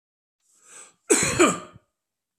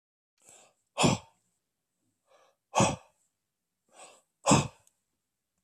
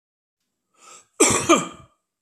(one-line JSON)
{"cough_length": "2.4 s", "cough_amplitude": 18828, "cough_signal_mean_std_ratio": 0.34, "exhalation_length": "5.6 s", "exhalation_amplitude": 12597, "exhalation_signal_mean_std_ratio": 0.25, "three_cough_length": "2.2 s", "three_cough_amplitude": 26415, "three_cough_signal_mean_std_ratio": 0.34, "survey_phase": "beta (2021-08-13 to 2022-03-07)", "age": "45-64", "gender": "Male", "wearing_mask": "No", "symptom_runny_or_blocked_nose": true, "smoker_status": "Ex-smoker", "respiratory_condition_asthma": false, "respiratory_condition_other": false, "recruitment_source": "REACT", "submission_delay": "2 days", "covid_test_result": "Negative", "covid_test_method": "RT-qPCR"}